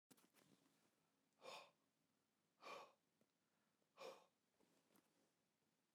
{"exhalation_length": "5.9 s", "exhalation_amplitude": 171, "exhalation_signal_mean_std_ratio": 0.37, "survey_phase": "beta (2021-08-13 to 2022-03-07)", "age": "45-64", "gender": "Male", "wearing_mask": "No", "symptom_none": true, "smoker_status": "Ex-smoker", "respiratory_condition_asthma": false, "respiratory_condition_other": false, "recruitment_source": "REACT", "submission_delay": "3 days", "covid_test_result": "Negative", "covid_test_method": "RT-qPCR"}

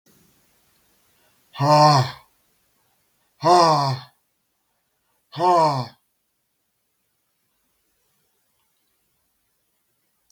{"exhalation_length": "10.3 s", "exhalation_amplitude": 24589, "exhalation_signal_mean_std_ratio": 0.31, "survey_phase": "beta (2021-08-13 to 2022-03-07)", "age": "65+", "gender": "Male", "wearing_mask": "No", "symptom_none": true, "smoker_status": "Ex-smoker", "respiratory_condition_asthma": false, "respiratory_condition_other": false, "recruitment_source": "REACT", "submission_delay": "2 days", "covid_test_result": "Negative", "covid_test_method": "RT-qPCR", "influenza_a_test_result": "Negative", "influenza_b_test_result": "Negative"}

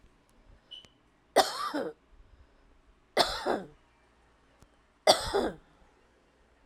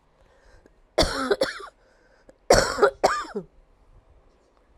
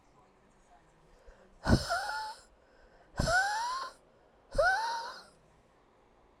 {"three_cough_length": "6.7 s", "three_cough_amplitude": 15674, "three_cough_signal_mean_std_ratio": 0.31, "cough_length": "4.8 s", "cough_amplitude": 30196, "cough_signal_mean_std_ratio": 0.36, "exhalation_length": "6.4 s", "exhalation_amplitude": 9830, "exhalation_signal_mean_std_ratio": 0.45, "survey_phase": "alpha (2021-03-01 to 2021-08-12)", "age": "45-64", "gender": "Female", "wearing_mask": "No", "symptom_new_continuous_cough": true, "symptom_abdominal_pain": true, "symptom_diarrhoea": true, "symptom_fatigue": true, "symptom_fever_high_temperature": true, "symptom_headache": true, "symptom_onset": "2 days", "smoker_status": "Never smoked", "respiratory_condition_asthma": false, "respiratory_condition_other": false, "recruitment_source": "Test and Trace", "submission_delay": "2 days", "covid_test_result": "Positive", "covid_test_method": "RT-qPCR", "covid_ct_value": 14.7, "covid_ct_gene": "ORF1ab gene", "covid_ct_mean": 15.2, "covid_viral_load": "10000000 copies/ml", "covid_viral_load_category": "High viral load (>1M copies/ml)"}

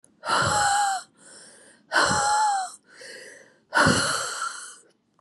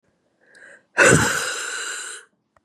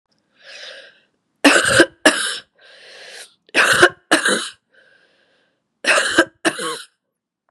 {"exhalation_length": "5.2 s", "exhalation_amplitude": 15736, "exhalation_signal_mean_std_ratio": 0.62, "cough_length": "2.6 s", "cough_amplitude": 28671, "cough_signal_mean_std_ratio": 0.43, "three_cough_length": "7.5 s", "three_cough_amplitude": 32768, "three_cough_signal_mean_std_ratio": 0.4, "survey_phase": "beta (2021-08-13 to 2022-03-07)", "age": "18-44", "gender": "Female", "wearing_mask": "No", "symptom_runny_or_blocked_nose": true, "symptom_sore_throat": true, "symptom_headache": true, "smoker_status": "Ex-smoker", "respiratory_condition_asthma": true, "respiratory_condition_other": false, "recruitment_source": "Test and Trace", "submission_delay": "3 days", "covid_test_result": "Positive", "covid_test_method": "LFT"}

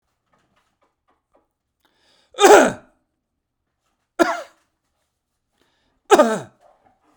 {"three_cough_length": "7.2 s", "three_cough_amplitude": 32768, "three_cough_signal_mean_std_ratio": 0.23, "survey_phase": "beta (2021-08-13 to 2022-03-07)", "age": "45-64", "gender": "Male", "wearing_mask": "No", "symptom_none": true, "smoker_status": "Ex-smoker", "respiratory_condition_asthma": false, "respiratory_condition_other": false, "recruitment_source": "REACT", "submission_delay": "4 days", "covid_test_result": "Negative", "covid_test_method": "RT-qPCR"}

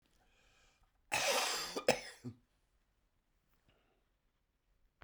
{"cough_length": "5.0 s", "cough_amplitude": 6332, "cough_signal_mean_std_ratio": 0.32, "survey_phase": "beta (2021-08-13 to 2022-03-07)", "age": "65+", "gender": "Male", "wearing_mask": "No", "symptom_cough_any": true, "symptom_runny_or_blocked_nose": true, "symptom_diarrhoea": true, "symptom_headache": true, "symptom_onset": "5 days", "smoker_status": "Ex-smoker", "respiratory_condition_asthma": false, "respiratory_condition_other": false, "recruitment_source": "Test and Trace", "submission_delay": "1 day", "covid_test_result": "Positive", "covid_test_method": "RT-qPCR", "covid_ct_value": 17.4, "covid_ct_gene": "S gene", "covid_ct_mean": 18.1, "covid_viral_load": "1200000 copies/ml", "covid_viral_load_category": "High viral load (>1M copies/ml)"}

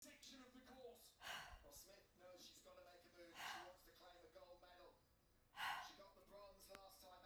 {"exhalation_length": "7.3 s", "exhalation_amplitude": 484, "exhalation_signal_mean_std_ratio": 0.66, "survey_phase": "beta (2021-08-13 to 2022-03-07)", "age": "45-64", "gender": "Female", "wearing_mask": "No", "symptom_none": true, "smoker_status": "Never smoked", "respiratory_condition_asthma": false, "respiratory_condition_other": false, "recruitment_source": "REACT", "submission_delay": "3 days", "covid_test_result": "Negative", "covid_test_method": "RT-qPCR", "influenza_a_test_result": "Negative", "influenza_b_test_result": "Negative"}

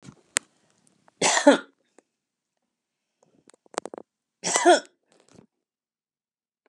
{"cough_length": "6.7 s", "cough_amplitude": 32121, "cough_signal_mean_std_ratio": 0.23, "survey_phase": "beta (2021-08-13 to 2022-03-07)", "age": "65+", "gender": "Female", "wearing_mask": "No", "symptom_none": true, "smoker_status": "Never smoked", "respiratory_condition_asthma": false, "respiratory_condition_other": false, "recruitment_source": "REACT", "submission_delay": "3 days", "covid_test_result": "Negative", "covid_test_method": "RT-qPCR", "influenza_a_test_result": "Negative", "influenza_b_test_result": "Negative"}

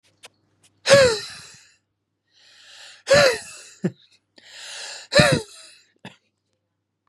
{"exhalation_length": "7.1 s", "exhalation_amplitude": 31259, "exhalation_signal_mean_std_ratio": 0.32, "survey_phase": "beta (2021-08-13 to 2022-03-07)", "age": "18-44", "gender": "Male", "wearing_mask": "No", "symptom_none": true, "symptom_onset": "12 days", "smoker_status": "Never smoked", "respiratory_condition_asthma": false, "respiratory_condition_other": false, "recruitment_source": "REACT", "submission_delay": "19 days", "covid_test_result": "Negative", "covid_test_method": "RT-qPCR"}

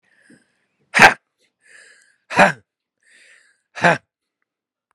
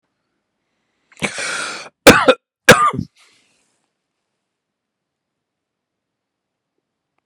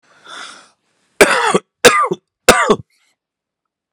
{"exhalation_length": "4.9 s", "exhalation_amplitude": 32768, "exhalation_signal_mean_std_ratio": 0.23, "cough_length": "7.3 s", "cough_amplitude": 32768, "cough_signal_mean_std_ratio": 0.23, "three_cough_length": "3.9 s", "three_cough_amplitude": 32768, "three_cough_signal_mean_std_ratio": 0.37, "survey_phase": "beta (2021-08-13 to 2022-03-07)", "age": "45-64", "gender": "Male", "wearing_mask": "No", "symptom_diarrhoea": true, "symptom_headache": true, "smoker_status": "Ex-smoker", "respiratory_condition_asthma": true, "respiratory_condition_other": false, "recruitment_source": "Test and Trace", "submission_delay": "2 days", "covid_test_result": "Positive", "covid_test_method": "RT-qPCR"}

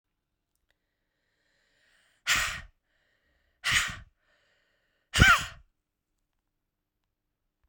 {"exhalation_length": "7.7 s", "exhalation_amplitude": 23755, "exhalation_signal_mean_std_ratio": 0.24, "survey_phase": "beta (2021-08-13 to 2022-03-07)", "age": "45-64", "gender": "Female", "wearing_mask": "No", "symptom_cough_any": true, "symptom_runny_or_blocked_nose": true, "symptom_sore_throat": true, "symptom_fatigue": true, "symptom_fever_high_temperature": true, "symptom_headache": true, "symptom_onset": "3 days", "smoker_status": "Ex-smoker", "respiratory_condition_asthma": false, "respiratory_condition_other": false, "recruitment_source": "Test and Trace", "submission_delay": "2 days", "covid_test_result": "Positive", "covid_test_method": "RT-qPCR", "covid_ct_value": 14.9, "covid_ct_gene": "ORF1ab gene", "covid_ct_mean": 15.4, "covid_viral_load": "8700000 copies/ml", "covid_viral_load_category": "High viral load (>1M copies/ml)"}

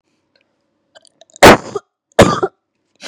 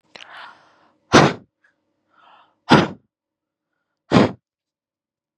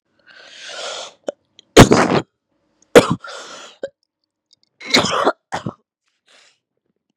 {"cough_length": "3.1 s", "cough_amplitude": 32768, "cough_signal_mean_std_ratio": 0.29, "exhalation_length": "5.4 s", "exhalation_amplitude": 32768, "exhalation_signal_mean_std_ratio": 0.25, "three_cough_length": "7.2 s", "three_cough_amplitude": 32768, "three_cough_signal_mean_std_ratio": 0.28, "survey_phase": "beta (2021-08-13 to 2022-03-07)", "age": "18-44", "gender": "Female", "wearing_mask": "No", "symptom_runny_or_blocked_nose": true, "symptom_sore_throat": true, "symptom_onset": "3 days", "smoker_status": "Never smoked", "respiratory_condition_asthma": false, "respiratory_condition_other": false, "recruitment_source": "Test and Trace", "submission_delay": "2 days", "covid_test_result": "Positive", "covid_test_method": "RT-qPCR", "covid_ct_value": 24.3, "covid_ct_gene": "ORF1ab gene"}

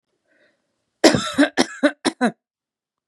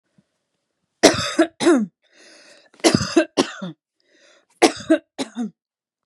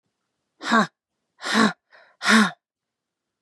{"cough_length": "3.1 s", "cough_amplitude": 32767, "cough_signal_mean_std_ratio": 0.33, "three_cough_length": "6.1 s", "three_cough_amplitude": 32768, "three_cough_signal_mean_std_ratio": 0.36, "exhalation_length": "3.4 s", "exhalation_amplitude": 21751, "exhalation_signal_mean_std_ratio": 0.35, "survey_phase": "beta (2021-08-13 to 2022-03-07)", "age": "18-44", "gender": "Female", "wearing_mask": "No", "symptom_none": true, "smoker_status": "Never smoked", "respiratory_condition_asthma": false, "respiratory_condition_other": false, "recruitment_source": "REACT", "submission_delay": "1 day", "covid_test_result": "Negative", "covid_test_method": "RT-qPCR", "influenza_a_test_result": "Negative", "influenza_b_test_result": "Negative"}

